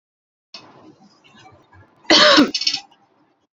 {
  "cough_length": "3.6 s",
  "cough_amplitude": 32678,
  "cough_signal_mean_std_ratio": 0.32,
  "survey_phase": "beta (2021-08-13 to 2022-03-07)",
  "age": "45-64",
  "gender": "Female",
  "wearing_mask": "No",
  "symptom_none": true,
  "smoker_status": "Never smoked",
  "respiratory_condition_asthma": false,
  "respiratory_condition_other": false,
  "recruitment_source": "REACT",
  "submission_delay": "8 days",
  "covid_test_result": "Negative",
  "covid_test_method": "RT-qPCR"
}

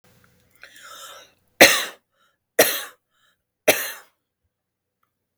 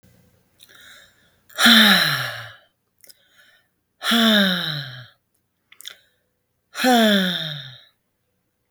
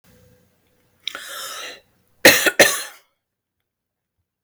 {
  "three_cough_length": "5.4 s",
  "three_cough_amplitude": 32768,
  "three_cough_signal_mean_std_ratio": 0.24,
  "exhalation_length": "8.7 s",
  "exhalation_amplitude": 32766,
  "exhalation_signal_mean_std_ratio": 0.41,
  "cough_length": "4.4 s",
  "cough_amplitude": 32768,
  "cough_signal_mean_std_ratio": 0.27,
  "survey_phase": "beta (2021-08-13 to 2022-03-07)",
  "age": "18-44",
  "gender": "Female",
  "wearing_mask": "No",
  "symptom_none": true,
  "smoker_status": "Ex-smoker",
  "respiratory_condition_asthma": false,
  "respiratory_condition_other": false,
  "recruitment_source": "REACT",
  "submission_delay": "0 days",
  "covid_test_result": "Negative",
  "covid_test_method": "RT-qPCR",
  "influenza_a_test_result": "Negative",
  "influenza_b_test_result": "Negative"
}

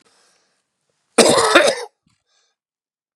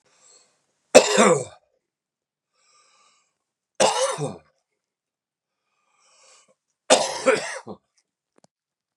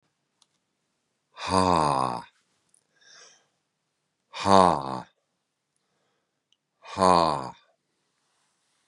{
  "cough_length": "3.2 s",
  "cough_amplitude": 32768,
  "cough_signal_mean_std_ratio": 0.34,
  "three_cough_length": "9.0 s",
  "three_cough_amplitude": 32768,
  "three_cough_signal_mean_std_ratio": 0.27,
  "exhalation_length": "8.9 s",
  "exhalation_amplitude": 27103,
  "exhalation_signal_mean_std_ratio": 0.28,
  "survey_phase": "beta (2021-08-13 to 2022-03-07)",
  "age": "45-64",
  "gender": "Male",
  "wearing_mask": "No",
  "symptom_runny_or_blocked_nose": true,
  "symptom_sore_throat": true,
  "symptom_fatigue": true,
  "symptom_headache": true,
  "symptom_onset": "3 days",
  "smoker_status": "Never smoked",
  "respiratory_condition_asthma": false,
  "respiratory_condition_other": false,
  "recruitment_source": "Test and Trace",
  "submission_delay": "2 days",
  "covid_test_result": "Positive",
  "covid_test_method": "RT-qPCR",
  "covid_ct_value": 22.7,
  "covid_ct_gene": "ORF1ab gene"
}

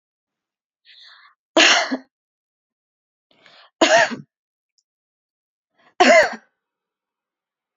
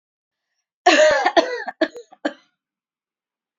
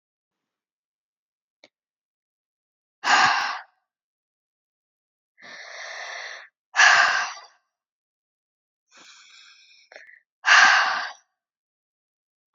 {
  "three_cough_length": "7.8 s",
  "three_cough_amplitude": 29070,
  "three_cough_signal_mean_std_ratio": 0.28,
  "cough_length": "3.6 s",
  "cough_amplitude": 29928,
  "cough_signal_mean_std_ratio": 0.36,
  "exhalation_length": "12.5 s",
  "exhalation_amplitude": 25125,
  "exhalation_signal_mean_std_ratio": 0.29,
  "survey_phase": "alpha (2021-03-01 to 2021-08-12)",
  "age": "18-44",
  "gender": "Female",
  "wearing_mask": "No",
  "symptom_none": true,
  "smoker_status": "Never smoked",
  "respiratory_condition_asthma": false,
  "respiratory_condition_other": false,
  "recruitment_source": "REACT",
  "submission_delay": "3 days",
  "covid_test_result": "Negative",
  "covid_test_method": "RT-qPCR"
}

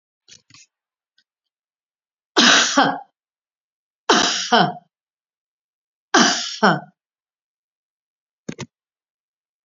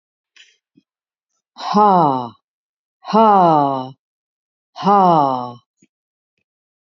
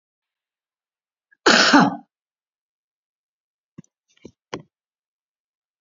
{
  "three_cough_length": "9.6 s",
  "three_cough_amplitude": 32767,
  "three_cough_signal_mean_std_ratio": 0.31,
  "exhalation_length": "6.9 s",
  "exhalation_amplitude": 29767,
  "exhalation_signal_mean_std_ratio": 0.41,
  "cough_length": "5.8 s",
  "cough_amplitude": 32767,
  "cough_signal_mean_std_ratio": 0.22,
  "survey_phase": "beta (2021-08-13 to 2022-03-07)",
  "age": "65+",
  "gender": "Female",
  "wearing_mask": "No",
  "symptom_cough_any": true,
  "smoker_status": "Never smoked",
  "respiratory_condition_asthma": false,
  "respiratory_condition_other": false,
  "recruitment_source": "REACT",
  "submission_delay": "1 day",
  "covid_test_result": "Negative",
  "covid_test_method": "RT-qPCR",
  "influenza_a_test_result": "Negative",
  "influenza_b_test_result": "Negative"
}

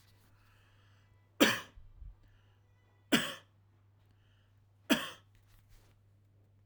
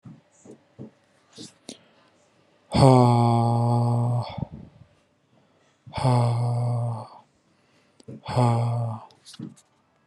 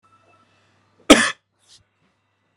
{
  "three_cough_length": "6.7 s",
  "three_cough_amplitude": 11264,
  "three_cough_signal_mean_std_ratio": 0.24,
  "exhalation_length": "10.1 s",
  "exhalation_amplitude": 24146,
  "exhalation_signal_mean_std_ratio": 0.51,
  "cough_length": "2.6 s",
  "cough_amplitude": 32768,
  "cough_signal_mean_std_ratio": 0.19,
  "survey_phase": "alpha (2021-03-01 to 2021-08-12)",
  "age": "18-44",
  "gender": "Male",
  "wearing_mask": "No",
  "symptom_none": true,
  "smoker_status": "Never smoked",
  "respiratory_condition_asthma": false,
  "respiratory_condition_other": false,
  "recruitment_source": "REACT",
  "submission_delay": "2 days",
  "covid_test_result": "Negative",
  "covid_test_method": "RT-qPCR"
}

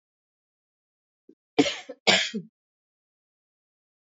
{
  "cough_length": "4.1 s",
  "cough_amplitude": 22406,
  "cough_signal_mean_std_ratio": 0.24,
  "survey_phase": "beta (2021-08-13 to 2022-03-07)",
  "age": "45-64",
  "gender": "Female",
  "wearing_mask": "No",
  "symptom_new_continuous_cough": true,
  "symptom_onset": "4 days",
  "smoker_status": "Never smoked",
  "respiratory_condition_asthma": false,
  "respiratory_condition_other": false,
  "recruitment_source": "Test and Trace",
  "submission_delay": "2 days",
  "covid_test_result": "Negative",
  "covid_test_method": "RT-qPCR"
}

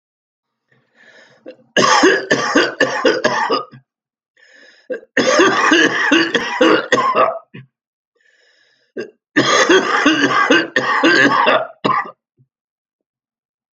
{
  "three_cough_length": "13.7 s",
  "three_cough_amplitude": 32767,
  "three_cough_signal_mean_std_ratio": 0.58,
  "survey_phase": "alpha (2021-03-01 to 2021-08-12)",
  "age": "65+",
  "gender": "Male",
  "wearing_mask": "No",
  "symptom_fatigue": true,
  "symptom_headache": true,
  "symptom_change_to_sense_of_smell_or_taste": true,
  "smoker_status": "Never smoked",
  "respiratory_condition_asthma": false,
  "respiratory_condition_other": false,
  "recruitment_source": "Test and Trace",
  "submission_delay": "2 days",
  "covid_test_result": "Positive",
  "covid_test_method": "LFT"
}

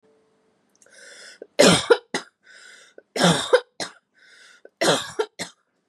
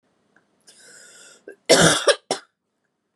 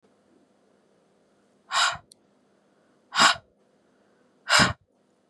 {
  "three_cough_length": "5.9 s",
  "three_cough_amplitude": 27287,
  "three_cough_signal_mean_std_ratio": 0.33,
  "cough_length": "3.2 s",
  "cough_amplitude": 29274,
  "cough_signal_mean_std_ratio": 0.3,
  "exhalation_length": "5.3 s",
  "exhalation_amplitude": 22368,
  "exhalation_signal_mean_std_ratio": 0.27,
  "survey_phase": "beta (2021-08-13 to 2022-03-07)",
  "age": "18-44",
  "gender": "Female",
  "wearing_mask": "No",
  "symptom_cough_any": true,
  "symptom_runny_or_blocked_nose": true,
  "symptom_fatigue": true,
  "smoker_status": "Never smoked",
  "respiratory_condition_asthma": false,
  "respiratory_condition_other": false,
  "recruitment_source": "REACT",
  "submission_delay": "2 days",
  "covid_test_result": "Negative",
  "covid_test_method": "RT-qPCR",
  "influenza_a_test_result": "Negative",
  "influenza_b_test_result": "Negative"
}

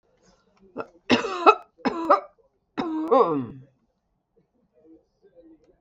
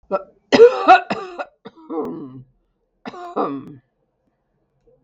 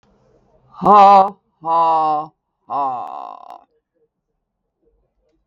{
  "three_cough_length": "5.8 s",
  "three_cough_amplitude": 32766,
  "three_cough_signal_mean_std_ratio": 0.34,
  "cough_length": "5.0 s",
  "cough_amplitude": 32768,
  "cough_signal_mean_std_ratio": 0.32,
  "exhalation_length": "5.5 s",
  "exhalation_amplitude": 32768,
  "exhalation_signal_mean_std_ratio": 0.39,
  "survey_phase": "beta (2021-08-13 to 2022-03-07)",
  "age": "65+",
  "gender": "Female",
  "wearing_mask": "No",
  "symptom_none": true,
  "smoker_status": "Ex-smoker",
  "respiratory_condition_asthma": false,
  "respiratory_condition_other": false,
  "recruitment_source": "REACT",
  "submission_delay": "2 days",
  "covid_test_result": "Negative",
  "covid_test_method": "RT-qPCR",
  "influenza_a_test_result": "Negative",
  "influenza_b_test_result": "Negative"
}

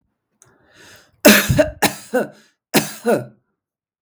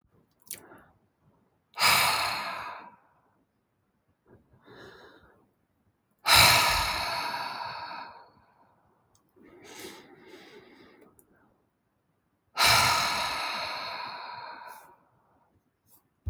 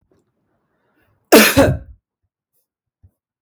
{
  "three_cough_length": "4.0 s",
  "three_cough_amplitude": 32768,
  "three_cough_signal_mean_std_ratio": 0.37,
  "exhalation_length": "16.3 s",
  "exhalation_amplitude": 18378,
  "exhalation_signal_mean_std_ratio": 0.38,
  "cough_length": "3.4 s",
  "cough_amplitude": 32768,
  "cough_signal_mean_std_ratio": 0.28,
  "survey_phase": "beta (2021-08-13 to 2022-03-07)",
  "age": "45-64",
  "gender": "Female",
  "wearing_mask": "No",
  "symptom_none": true,
  "smoker_status": "Current smoker (e-cigarettes or vapes only)",
  "respiratory_condition_asthma": false,
  "respiratory_condition_other": false,
  "recruitment_source": "REACT",
  "submission_delay": "6 days",
  "covid_test_result": "Negative",
  "covid_test_method": "RT-qPCR",
  "influenza_a_test_result": "Negative",
  "influenza_b_test_result": "Negative"
}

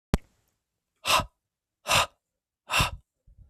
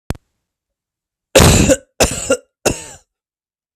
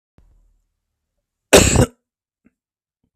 {
  "exhalation_length": "3.5 s",
  "exhalation_amplitude": 20433,
  "exhalation_signal_mean_std_ratio": 0.33,
  "three_cough_length": "3.8 s",
  "three_cough_amplitude": 32768,
  "three_cough_signal_mean_std_ratio": 0.36,
  "cough_length": "3.2 s",
  "cough_amplitude": 32768,
  "cough_signal_mean_std_ratio": 0.25,
  "survey_phase": "beta (2021-08-13 to 2022-03-07)",
  "age": "18-44",
  "gender": "Male",
  "wearing_mask": "No",
  "symptom_none": true,
  "smoker_status": "Never smoked",
  "respiratory_condition_asthma": false,
  "respiratory_condition_other": false,
  "recruitment_source": "REACT",
  "submission_delay": "3 days",
  "covid_test_result": "Negative",
  "covid_test_method": "RT-qPCR",
  "influenza_a_test_result": "Negative",
  "influenza_b_test_result": "Negative"
}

